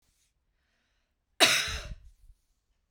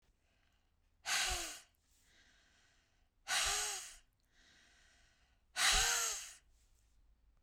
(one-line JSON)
{"cough_length": "2.9 s", "cough_amplitude": 15733, "cough_signal_mean_std_ratio": 0.27, "exhalation_length": "7.4 s", "exhalation_amplitude": 3639, "exhalation_signal_mean_std_ratio": 0.4, "survey_phase": "beta (2021-08-13 to 2022-03-07)", "age": "45-64", "gender": "Female", "wearing_mask": "No", "symptom_none": true, "smoker_status": "Never smoked", "respiratory_condition_asthma": false, "respiratory_condition_other": false, "recruitment_source": "REACT", "submission_delay": "3 days", "covid_test_result": "Negative", "covid_test_method": "RT-qPCR"}